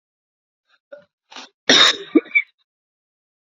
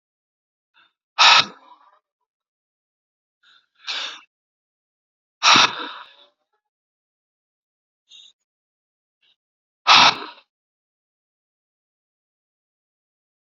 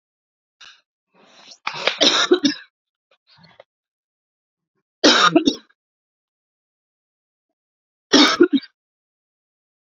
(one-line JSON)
{"cough_length": "3.6 s", "cough_amplitude": 30322, "cough_signal_mean_std_ratio": 0.27, "exhalation_length": "13.6 s", "exhalation_amplitude": 32448, "exhalation_signal_mean_std_ratio": 0.21, "three_cough_length": "9.9 s", "three_cough_amplitude": 32187, "three_cough_signal_mean_std_ratio": 0.29, "survey_phase": "beta (2021-08-13 to 2022-03-07)", "age": "18-44", "gender": "Female", "wearing_mask": "No", "symptom_runny_or_blocked_nose": true, "symptom_sore_throat": true, "symptom_fatigue": true, "symptom_fever_high_temperature": true, "symptom_headache": true, "symptom_other": true, "smoker_status": "Current smoker (11 or more cigarettes per day)", "respiratory_condition_asthma": false, "respiratory_condition_other": false, "recruitment_source": "Test and Trace", "submission_delay": "2 days", "covid_test_result": "Positive", "covid_test_method": "RT-qPCR", "covid_ct_value": 22.8, "covid_ct_gene": "ORF1ab gene", "covid_ct_mean": 23.4, "covid_viral_load": "21000 copies/ml", "covid_viral_load_category": "Low viral load (10K-1M copies/ml)"}